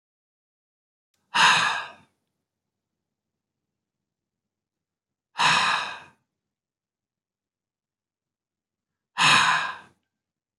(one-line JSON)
{"exhalation_length": "10.6 s", "exhalation_amplitude": 18059, "exhalation_signal_mean_std_ratio": 0.3, "survey_phase": "beta (2021-08-13 to 2022-03-07)", "age": "65+", "gender": "Male", "wearing_mask": "No", "symptom_cough_any": true, "smoker_status": "Never smoked", "recruitment_source": "REACT", "submission_delay": "2 days", "covid_test_result": "Negative", "covid_test_method": "RT-qPCR", "influenza_a_test_result": "Negative", "influenza_b_test_result": "Negative"}